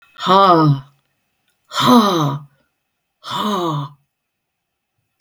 {"exhalation_length": "5.2 s", "exhalation_amplitude": 32768, "exhalation_signal_mean_std_ratio": 0.46, "survey_phase": "beta (2021-08-13 to 2022-03-07)", "age": "65+", "gender": "Female", "wearing_mask": "No", "symptom_none": true, "smoker_status": "Never smoked", "respiratory_condition_asthma": false, "respiratory_condition_other": false, "recruitment_source": "REACT", "submission_delay": "1 day", "covid_test_result": "Negative", "covid_test_method": "RT-qPCR", "influenza_a_test_result": "Negative", "influenza_b_test_result": "Negative"}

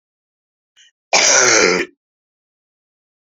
{"cough_length": "3.3 s", "cough_amplitude": 32694, "cough_signal_mean_std_ratio": 0.38, "survey_phase": "beta (2021-08-13 to 2022-03-07)", "age": "45-64", "gender": "Female", "wearing_mask": "No", "symptom_cough_any": true, "symptom_runny_or_blocked_nose": true, "symptom_shortness_of_breath": true, "symptom_diarrhoea": true, "symptom_fatigue": true, "symptom_fever_high_temperature": true, "symptom_change_to_sense_of_smell_or_taste": true, "symptom_loss_of_taste": true, "smoker_status": "Current smoker (1 to 10 cigarettes per day)", "respiratory_condition_asthma": false, "respiratory_condition_other": false, "recruitment_source": "Test and Trace", "submission_delay": "2 days", "covid_test_result": "Positive", "covid_test_method": "RT-qPCR", "covid_ct_value": 16.4, "covid_ct_gene": "ORF1ab gene", "covid_ct_mean": 16.8, "covid_viral_load": "3000000 copies/ml", "covid_viral_load_category": "High viral load (>1M copies/ml)"}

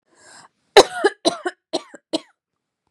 {"cough_length": "2.9 s", "cough_amplitude": 32768, "cough_signal_mean_std_ratio": 0.24, "survey_phase": "beta (2021-08-13 to 2022-03-07)", "age": "18-44", "gender": "Female", "wearing_mask": "No", "symptom_abdominal_pain": true, "symptom_fatigue": true, "symptom_headache": true, "symptom_onset": "7 days", "smoker_status": "Never smoked", "respiratory_condition_asthma": false, "respiratory_condition_other": false, "recruitment_source": "REACT", "submission_delay": "3 days", "covid_test_result": "Negative", "covid_test_method": "RT-qPCR"}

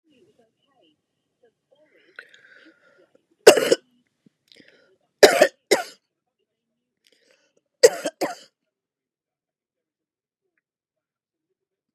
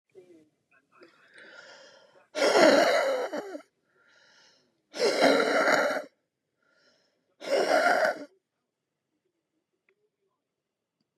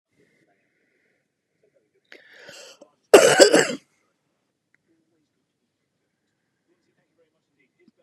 {"three_cough_length": "11.9 s", "three_cough_amplitude": 32768, "three_cough_signal_mean_std_ratio": 0.17, "exhalation_length": "11.2 s", "exhalation_amplitude": 16454, "exhalation_signal_mean_std_ratio": 0.41, "cough_length": "8.0 s", "cough_amplitude": 32768, "cough_signal_mean_std_ratio": 0.19, "survey_phase": "beta (2021-08-13 to 2022-03-07)", "age": "65+", "gender": "Female", "wearing_mask": "No", "symptom_runny_or_blocked_nose": true, "symptom_fatigue": true, "symptom_onset": "12 days", "smoker_status": "Ex-smoker", "respiratory_condition_asthma": false, "respiratory_condition_other": true, "recruitment_source": "REACT", "submission_delay": "3 days", "covid_test_result": "Negative", "covid_test_method": "RT-qPCR", "influenza_a_test_result": "Negative", "influenza_b_test_result": "Negative"}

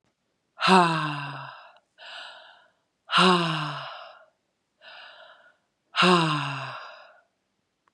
{"exhalation_length": "7.9 s", "exhalation_amplitude": 19710, "exhalation_signal_mean_std_ratio": 0.4, "survey_phase": "beta (2021-08-13 to 2022-03-07)", "age": "45-64", "gender": "Female", "wearing_mask": "No", "symptom_cough_any": true, "symptom_runny_or_blocked_nose": true, "symptom_sore_throat": true, "symptom_change_to_sense_of_smell_or_taste": true, "symptom_loss_of_taste": true, "symptom_onset": "3 days", "smoker_status": "Ex-smoker", "respiratory_condition_asthma": false, "respiratory_condition_other": false, "recruitment_source": "Test and Trace", "submission_delay": "2 days", "covid_test_result": "Positive", "covid_test_method": "RT-qPCR", "covid_ct_value": 16.6, "covid_ct_gene": "ORF1ab gene", "covid_ct_mean": 16.8, "covid_viral_load": "3000000 copies/ml", "covid_viral_load_category": "High viral load (>1M copies/ml)"}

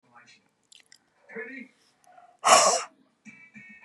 {"exhalation_length": "3.8 s", "exhalation_amplitude": 26068, "exhalation_signal_mean_std_ratio": 0.28, "survey_phase": "beta (2021-08-13 to 2022-03-07)", "age": "45-64", "gender": "Female", "wearing_mask": "No", "symptom_none": true, "smoker_status": "Never smoked", "respiratory_condition_asthma": false, "respiratory_condition_other": false, "recruitment_source": "REACT", "submission_delay": "1 day", "covid_test_result": "Negative", "covid_test_method": "RT-qPCR", "influenza_a_test_result": "Negative", "influenza_b_test_result": "Negative"}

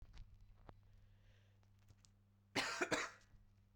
{"cough_length": "3.8 s", "cough_amplitude": 1767, "cough_signal_mean_std_ratio": 0.38, "survey_phase": "beta (2021-08-13 to 2022-03-07)", "age": "18-44", "gender": "Female", "wearing_mask": "No", "symptom_cough_any": true, "symptom_new_continuous_cough": true, "symptom_runny_or_blocked_nose": true, "symptom_sore_throat": true, "symptom_fatigue": true, "symptom_change_to_sense_of_smell_or_taste": true, "symptom_onset": "3 days", "smoker_status": "Ex-smoker", "respiratory_condition_asthma": true, "respiratory_condition_other": false, "recruitment_source": "Test and Trace", "submission_delay": "2 days", "covid_test_result": "Positive", "covid_test_method": "RT-qPCR", "covid_ct_value": 20.9, "covid_ct_gene": "ORF1ab gene", "covid_ct_mean": 21.4, "covid_viral_load": "99000 copies/ml", "covid_viral_load_category": "Low viral load (10K-1M copies/ml)"}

